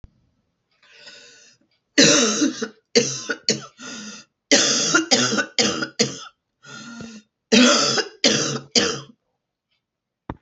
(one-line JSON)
{"three_cough_length": "10.4 s", "three_cough_amplitude": 32221, "three_cough_signal_mean_std_ratio": 0.47, "survey_phase": "beta (2021-08-13 to 2022-03-07)", "age": "45-64", "gender": "Female", "wearing_mask": "No", "symptom_cough_any": true, "symptom_new_continuous_cough": true, "symptom_runny_or_blocked_nose": true, "symptom_shortness_of_breath": true, "symptom_sore_throat": true, "symptom_abdominal_pain": true, "symptom_fatigue": true, "symptom_headache": true, "symptom_change_to_sense_of_smell_or_taste": true, "symptom_other": true, "smoker_status": "Never smoked", "respiratory_condition_asthma": false, "respiratory_condition_other": false, "recruitment_source": "Test and Trace", "submission_delay": "0 days", "covid_test_result": "Positive", "covid_test_method": "LFT"}